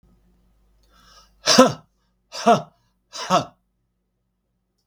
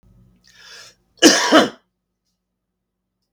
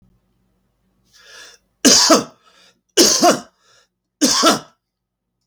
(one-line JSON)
{"exhalation_length": "4.9 s", "exhalation_amplitude": 32768, "exhalation_signal_mean_std_ratio": 0.27, "cough_length": "3.3 s", "cough_amplitude": 32768, "cough_signal_mean_std_ratio": 0.28, "three_cough_length": "5.5 s", "three_cough_amplitude": 32768, "three_cough_signal_mean_std_ratio": 0.38, "survey_phase": "beta (2021-08-13 to 2022-03-07)", "age": "65+", "gender": "Male", "wearing_mask": "No", "symptom_cough_any": true, "smoker_status": "Ex-smoker", "respiratory_condition_asthma": true, "respiratory_condition_other": false, "recruitment_source": "REACT", "submission_delay": "18 days", "covid_test_result": "Negative", "covid_test_method": "RT-qPCR", "influenza_a_test_result": "Negative", "influenza_b_test_result": "Negative"}